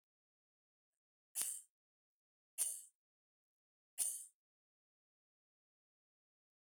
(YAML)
three_cough_length: 6.7 s
three_cough_amplitude: 4003
three_cough_signal_mean_std_ratio: 0.24
survey_phase: beta (2021-08-13 to 2022-03-07)
age: 65+
gender: Female
wearing_mask: 'No'
symptom_none: true
smoker_status: Never smoked
respiratory_condition_asthma: false
respiratory_condition_other: false
recruitment_source: REACT
submission_delay: 1 day
covid_test_result: Negative
covid_test_method: RT-qPCR
influenza_a_test_result: Negative
influenza_b_test_result: Negative